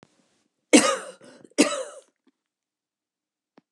{
  "cough_length": "3.7 s",
  "cough_amplitude": 26987,
  "cough_signal_mean_std_ratio": 0.25,
  "survey_phase": "alpha (2021-03-01 to 2021-08-12)",
  "age": "65+",
  "gender": "Female",
  "wearing_mask": "No",
  "symptom_none": true,
  "smoker_status": "Never smoked",
  "respiratory_condition_asthma": true,
  "respiratory_condition_other": false,
  "recruitment_source": "REACT",
  "submission_delay": "1 day",
  "covid_test_result": "Negative",
  "covid_test_method": "RT-qPCR"
}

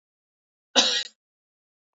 {
  "cough_length": "2.0 s",
  "cough_amplitude": 20211,
  "cough_signal_mean_std_ratio": 0.28,
  "survey_phase": "beta (2021-08-13 to 2022-03-07)",
  "age": "18-44",
  "gender": "Female",
  "wearing_mask": "No",
  "symptom_cough_any": true,
  "symptom_runny_or_blocked_nose": true,
  "symptom_fatigue": true,
  "symptom_headache": true,
  "symptom_onset": "3 days",
  "smoker_status": "Ex-smoker",
  "respiratory_condition_asthma": false,
  "respiratory_condition_other": false,
  "recruitment_source": "Test and Trace",
  "submission_delay": "2 days",
  "covid_test_result": "Positive",
  "covid_test_method": "RT-qPCR",
  "covid_ct_value": 19.9,
  "covid_ct_gene": "ORF1ab gene",
  "covid_ct_mean": 20.7,
  "covid_viral_load": "160000 copies/ml",
  "covid_viral_load_category": "Low viral load (10K-1M copies/ml)"
}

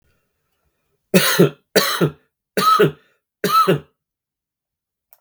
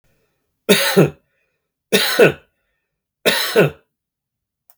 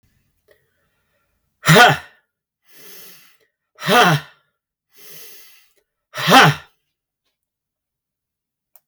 {
  "cough_length": "5.2 s",
  "cough_amplitude": 32768,
  "cough_signal_mean_std_ratio": 0.41,
  "three_cough_length": "4.8 s",
  "three_cough_amplitude": 32768,
  "three_cough_signal_mean_std_ratio": 0.38,
  "exhalation_length": "8.9 s",
  "exhalation_amplitude": 32768,
  "exhalation_signal_mean_std_ratio": 0.28,
  "survey_phase": "beta (2021-08-13 to 2022-03-07)",
  "age": "65+",
  "gender": "Male",
  "wearing_mask": "No",
  "symptom_none": true,
  "smoker_status": "Never smoked",
  "respiratory_condition_asthma": false,
  "respiratory_condition_other": false,
  "recruitment_source": "REACT",
  "submission_delay": "3 days",
  "covid_test_result": "Negative",
  "covid_test_method": "RT-qPCR",
  "influenza_a_test_result": "Negative",
  "influenza_b_test_result": "Negative"
}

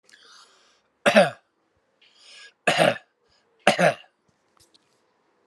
{
  "three_cough_length": "5.5 s",
  "three_cough_amplitude": 32767,
  "three_cough_signal_mean_std_ratio": 0.28,
  "survey_phase": "alpha (2021-03-01 to 2021-08-12)",
  "age": "45-64",
  "gender": "Male",
  "wearing_mask": "No",
  "symptom_none": true,
  "smoker_status": "Ex-smoker",
  "respiratory_condition_asthma": false,
  "respiratory_condition_other": false,
  "recruitment_source": "REACT",
  "submission_delay": "4 days",
  "covid_test_result": "Negative",
  "covid_test_method": "RT-qPCR"
}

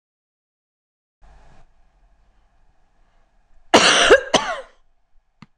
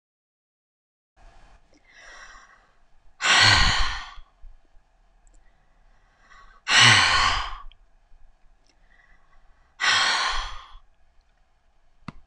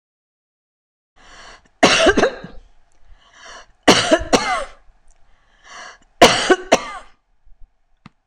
{
  "cough_length": "5.6 s",
  "cough_amplitude": 26028,
  "cough_signal_mean_std_ratio": 0.27,
  "exhalation_length": "12.3 s",
  "exhalation_amplitude": 23995,
  "exhalation_signal_mean_std_ratio": 0.36,
  "three_cough_length": "8.3 s",
  "three_cough_amplitude": 26028,
  "three_cough_signal_mean_std_ratio": 0.35,
  "survey_phase": "alpha (2021-03-01 to 2021-08-12)",
  "age": "65+",
  "gender": "Female",
  "wearing_mask": "No",
  "symptom_cough_any": true,
  "smoker_status": "Ex-smoker",
  "respiratory_condition_asthma": false,
  "respiratory_condition_other": false,
  "recruitment_source": "REACT",
  "submission_delay": "2 days",
  "covid_test_result": "Negative",
  "covid_test_method": "RT-qPCR"
}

